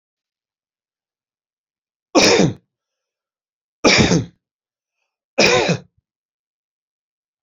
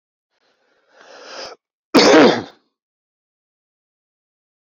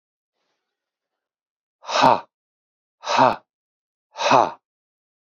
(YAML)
three_cough_length: 7.4 s
three_cough_amplitude: 31463
three_cough_signal_mean_std_ratio: 0.31
cough_length: 4.7 s
cough_amplitude: 30162
cough_signal_mean_std_ratio: 0.27
exhalation_length: 5.4 s
exhalation_amplitude: 29381
exhalation_signal_mean_std_ratio: 0.29
survey_phase: beta (2021-08-13 to 2022-03-07)
age: 45-64
gender: Male
wearing_mask: 'No'
symptom_sore_throat: true
symptom_onset: 11 days
smoker_status: Never smoked
respiratory_condition_asthma: false
respiratory_condition_other: false
recruitment_source: REACT
submission_delay: 3 days
covid_test_result: Positive
covid_test_method: RT-qPCR
covid_ct_value: 36.8
covid_ct_gene: N gene
influenza_a_test_result: Negative
influenza_b_test_result: Negative